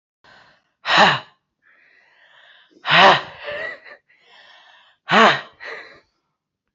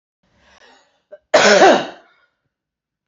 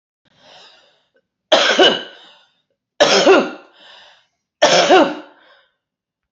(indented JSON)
{
  "exhalation_length": "6.7 s",
  "exhalation_amplitude": 28721,
  "exhalation_signal_mean_std_ratio": 0.33,
  "cough_length": "3.1 s",
  "cough_amplitude": 30025,
  "cough_signal_mean_std_ratio": 0.34,
  "three_cough_length": "6.3 s",
  "three_cough_amplitude": 31455,
  "three_cough_signal_mean_std_ratio": 0.4,
  "survey_phase": "beta (2021-08-13 to 2022-03-07)",
  "age": "18-44",
  "gender": "Female",
  "wearing_mask": "No",
  "symptom_cough_any": true,
  "symptom_runny_or_blocked_nose": true,
  "symptom_shortness_of_breath": true,
  "symptom_sore_throat": true,
  "symptom_diarrhoea": true,
  "symptom_fatigue": true,
  "symptom_headache": true,
  "symptom_change_to_sense_of_smell_or_taste": true,
  "symptom_loss_of_taste": true,
  "symptom_onset": "2 days",
  "smoker_status": "Prefer not to say",
  "respiratory_condition_asthma": true,
  "respiratory_condition_other": false,
  "recruitment_source": "Test and Trace",
  "submission_delay": "1 day",
  "covid_test_result": "Positive",
  "covid_test_method": "ePCR"
}